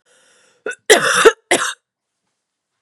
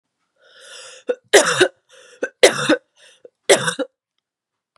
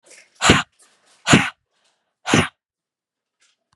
{
  "cough_length": "2.8 s",
  "cough_amplitude": 32768,
  "cough_signal_mean_std_ratio": 0.35,
  "three_cough_length": "4.8 s",
  "three_cough_amplitude": 32768,
  "three_cough_signal_mean_std_ratio": 0.33,
  "exhalation_length": "3.8 s",
  "exhalation_amplitude": 32768,
  "exhalation_signal_mean_std_ratio": 0.3,
  "survey_phase": "beta (2021-08-13 to 2022-03-07)",
  "age": "18-44",
  "gender": "Female",
  "wearing_mask": "No",
  "symptom_cough_any": true,
  "symptom_runny_or_blocked_nose": true,
  "symptom_sore_throat": true,
  "symptom_abdominal_pain": true,
  "symptom_diarrhoea": true,
  "symptom_fatigue": true,
  "symptom_headache": true,
  "symptom_change_to_sense_of_smell_or_taste": true,
  "symptom_other": true,
  "symptom_onset": "6 days",
  "smoker_status": "Never smoked",
  "respiratory_condition_asthma": false,
  "respiratory_condition_other": false,
  "recruitment_source": "Test and Trace",
  "submission_delay": "1 day",
  "covid_test_result": "Positive",
  "covid_test_method": "RT-qPCR"
}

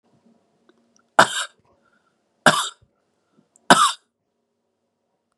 {
  "three_cough_length": "5.4 s",
  "three_cough_amplitude": 32768,
  "three_cough_signal_mean_std_ratio": 0.23,
  "survey_phase": "beta (2021-08-13 to 2022-03-07)",
  "age": "45-64",
  "gender": "Male",
  "wearing_mask": "No",
  "symptom_cough_any": true,
  "symptom_runny_or_blocked_nose": true,
  "symptom_onset": "2 days",
  "smoker_status": "Ex-smoker",
  "respiratory_condition_asthma": false,
  "respiratory_condition_other": false,
  "recruitment_source": "Test and Trace",
  "submission_delay": "2 days",
  "covid_test_result": "Positive",
  "covid_test_method": "RT-qPCR",
  "covid_ct_value": 26.5,
  "covid_ct_gene": "ORF1ab gene",
  "covid_ct_mean": 26.8,
  "covid_viral_load": "1600 copies/ml",
  "covid_viral_load_category": "Minimal viral load (< 10K copies/ml)"
}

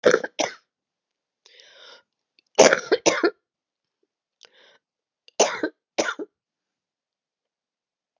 {
  "three_cough_length": "8.2 s",
  "three_cough_amplitude": 32765,
  "three_cough_signal_mean_std_ratio": 0.25,
  "survey_phase": "beta (2021-08-13 to 2022-03-07)",
  "age": "65+",
  "gender": "Female",
  "wearing_mask": "No",
  "symptom_cough_any": true,
  "symptom_new_continuous_cough": true,
  "symptom_runny_or_blocked_nose": true,
  "symptom_sore_throat": true,
  "symptom_change_to_sense_of_smell_or_taste": true,
  "symptom_loss_of_taste": true,
  "symptom_onset": "3 days",
  "smoker_status": "Never smoked",
  "respiratory_condition_asthma": false,
  "respiratory_condition_other": false,
  "recruitment_source": "Test and Trace",
  "submission_delay": "1 day",
  "covid_test_result": "Negative",
  "covid_test_method": "ePCR"
}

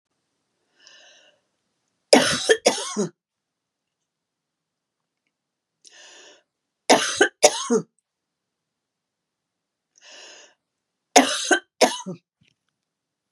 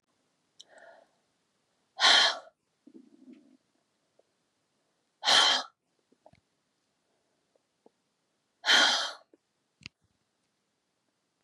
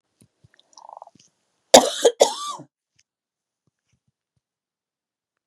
{
  "three_cough_length": "13.3 s",
  "three_cough_amplitude": 32768,
  "three_cough_signal_mean_std_ratio": 0.26,
  "exhalation_length": "11.4 s",
  "exhalation_amplitude": 13022,
  "exhalation_signal_mean_std_ratio": 0.26,
  "cough_length": "5.5 s",
  "cough_amplitude": 32768,
  "cough_signal_mean_std_ratio": 0.19,
  "survey_phase": "beta (2021-08-13 to 2022-03-07)",
  "age": "65+",
  "gender": "Female",
  "wearing_mask": "No",
  "symptom_none": true,
  "smoker_status": "Never smoked",
  "respiratory_condition_asthma": false,
  "respiratory_condition_other": false,
  "recruitment_source": "REACT",
  "submission_delay": "1 day",
  "covid_test_result": "Negative",
  "covid_test_method": "RT-qPCR",
  "influenza_a_test_result": "Negative",
  "influenza_b_test_result": "Negative"
}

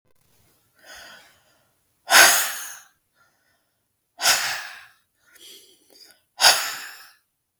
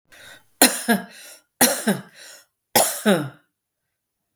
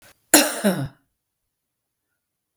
{
  "exhalation_length": "7.6 s",
  "exhalation_amplitude": 32768,
  "exhalation_signal_mean_std_ratio": 0.29,
  "three_cough_length": "4.4 s",
  "three_cough_amplitude": 32766,
  "three_cough_signal_mean_std_ratio": 0.38,
  "cough_length": "2.6 s",
  "cough_amplitude": 32768,
  "cough_signal_mean_std_ratio": 0.29,
  "survey_phase": "beta (2021-08-13 to 2022-03-07)",
  "age": "45-64",
  "gender": "Female",
  "wearing_mask": "No",
  "symptom_headache": true,
  "symptom_onset": "11 days",
  "smoker_status": "Never smoked",
  "respiratory_condition_asthma": false,
  "respiratory_condition_other": false,
  "recruitment_source": "REACT",
  "submission_delay": "5 days",
  "covid_test_result": "Negative",
  "covid_test_method": "RT-qPCR"
}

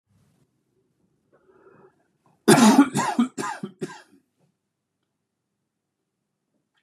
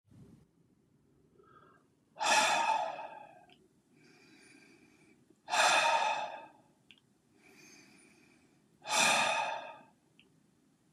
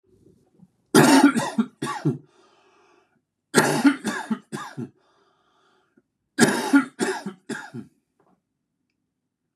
{
  "cough_length": "6.8 s",
  "cough_amplitude": 27206,
  "cough_signal_mean_std_ratio": 0.26,
  "exhalation_length": "10.9 s",
  "exhalation_amplitude": 6334,
  "exhalation_signal_mean_std_ratio": 0.4,
  "three_cough_length": "9.6 s",
  "three_cough_amplitude": 30150,
  "three_cough_signal_mean_std_ratio": 0.36,
  "survey_phase": "beta (2021-08-13 to 2022-03-07)",
  "age": "45-64",
  "gender": "Male",
  "wearing_mask": "No",
  "symptom_cough_any": true,
  "smoker_status": "Never smoked",
  "respiratory_condition_asthma": false,
  "respiratory_condition_other": false,
  "recruitment_source": "REACT",
  "submission_delay": "0 days",
  "covid_test_result": "Negative",
  "covid_test_method": "RT-qPCR",
  "influenza_a_test_result": "Negative",
  "influenza_b_test_result": "Negative"
}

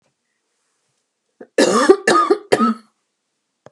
{
  "cough_length": "3.7 s",
  "cough_amplitude": 32768,
  "cough_signal_mean_std_ratio": 0.39,
  "survey_phase": "beta (2021-08-13 to 2022-03-07)",
  "age": "45-64",
  "gender": "Female",
  "wearing_mask": "No",
  "symptom_cough_any": true,
  "smoker_status": "Ex-smoker",
  "respiratory_condition_asthma": false,
  "respiratory_condition_other": false,
  "recruitment_source": "REACT",
  "submission_delay": "1 day",
  "covid_test_result": "Negative",
  "covid_test_method": "RT-qPCR",
  "influenza_a_test_result": "Negative",
  "influenza_b_test_result": "Negative"
}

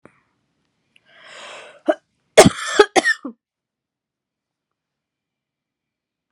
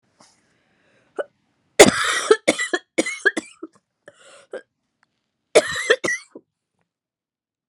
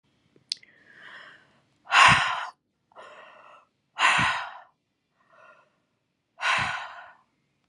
{
  "cough_length": "6.3 s",
  "cough_amplitude": 32768,
  "cough_signal_mean_std_ratio": 0.2,
  "three_cough_length": "7.7 s",
  "three_cough_amplitude": 32768,
  "three_cough_signal_mean_std_ratio": 0.28,
  "exhalation_length": "7.7 s",
  "exhalation_amplitude": 23492,
  "exhalation_signal_mean_std_ratio": 0.33,
  "survey_phase": "beta (2021-08-13 to 2022-03-07)",
  "age": "18-44",
  "gender": "Female",
  "wearing_mask": "No",
  "symptom_cough_any": true,
  "symptom_runny_or_blocked_nose": true,
  "symptom_shortness_of_breath": true,
  "symptom_sore_throat": true,
  "symptom_abdominal_pain": true,
  "symptom_diarrhoea": true,
  "symptom_fatigue": true,
  "symptom_fever_high_temperature": true,
  "symptom_headache": true,
  "symptom_change_to_sense_of_smell_or_taste": true,
  "symptom_other": true,
  "symptom_onset": "6 days",
  "smoker_status": "Never smoked",
  "respiratory_condition_asthma": false,
  "respiratory_condition_other": false,
  "recruitment_source": "Test and Trace",
  "submission_delay": "2 days",
  "covid_test_result": "Positive",
  "covid_test_method": "ePCR"
}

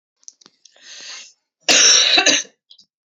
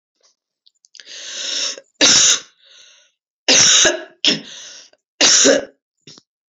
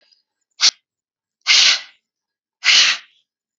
{
  "cough_length": "3.1 s",
  "cough_amplitude": 31369,
  "cough_signal_mean_std_ratio": 0.42,
  "three_cough_length": "6.5 s",
  "three_cough_amplitude": 32768,
  "three_cough_signal_mean_std_ratio": 0.44,
  "exhalation_length": "3.6 s",
  "exhalation_amplitude": 32768,
  "exhalation_signal_mean_std_ratio": 0.36,
  "survey_phase": "beta (2021-08-13 to 2022-03-07)",
  "age": "18-44",
  "gender": "Female",
  "wearing_mask": "No",
  "symptom_cough_any": true,
  "symptom_runny_or_blocked_nose": true,
  "symptom_sore_throat": true,
  "symptom_headache": true,
  "symptom_onset": "3 days",
  "smoker_status": "Never smoked",
  "respiratory_condition_asthma": true,
  "respiratory_condition_other": false,
  "recruitment_source": "Test and Trace",
  "submission_delay": "2 days",
  "covid_test_result": "Positive",
  "covid_test_method": "RT-qPCR"
}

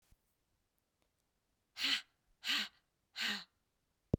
{
  "exhalation_length": "4.2 s",
  "exhalation_amplitude": 4481,
  "exhalation_signal_mean_std_ratio": 0.31,
  "survey_phase": "beta (2021-08-13 to 2022-03-07)",
  "age": "18-44",
  "gender": "Female",
  "wearing_mask": "No",
  "symptom_none": true,
  "smoker_status": "Never smoked",
  "respiratory_condition_asthma": false,
  "respiratory_condition_other": false,
  "recruitment_source": "REACT",
  "submission_delay": "1 day",
  "covid_test_result": "Negative",
  "covid_test_method": "RT-qPCR"
}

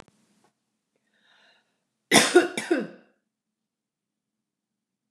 {
  "cough_length": "5.1 s",
  "cough_amplitude": 28425,
  "cough_signal_mean_std_ratio": 0.23,
  "survey_phase": "beta (2021-08-13 to 2022-03-07)",
  "age": "65+",
  "gender": "Female",
  "wearing_mask": "No",
  "symptom_none": true,
  "smoker_status": "Never smoked",
  "respiratory_condition_asthma": false,
  "respiratory_condition_other": false,
  "recruitment_source": "REACT",
  "submission_delay": "2 days",
  "covid_test_result": "Negative",
  "covid_test_method": "RT-qPCR",
  "influenza_a_test_result": "Negative",
  "influenza_b_test_result": "Negative"
}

